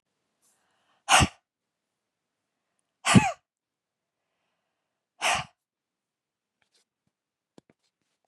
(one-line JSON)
{"exhalation_length": "8.3 s", "exhalation_amplitude": 24657, "exhalation_signal_mean_std_ratio": 0.19, "survey_phase": "beta (2021-08-13 to 2022-03-07)", "age": "45-64", "gender": "Female", "wearing_mask": "No", "symptom_none": true, "smoker_status": "Never smoked", "respiratory_condition_asthma": false, "respiratory_condition_other": false, "recruitment_source": "REACT", "submission_delay": "1 day", "covid_test_result": "Negative", "covid_test_method": "RT-qPCR", "influenza_a_test_result": "Unknown/Void", "influenza_b_test_result": "Unknown/Void"}